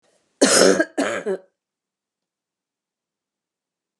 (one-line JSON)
{"cough_length": "4.0 s", "cough_amplitude": 27801, "cough_signal_mean_std_ratio": 0.32, "survey_phase": "beta (2021-08-13 to 2022-03-07)", "age": "65+", "gender": "Female", "wearing_mask": "No", "symptom_cough_any": true, "smoker_status": "Never smoked", "respiratory_condition_asthma": false, "respiratory_condition_other": false, "recruitment_source": "REACT", "submission_delay": "1 day", "covid_test_result": "Negative", "covid_test_method": "RT-qPCR", "influenza_a_test_result": "Negative", "influenza_b_test_result": "Negative"}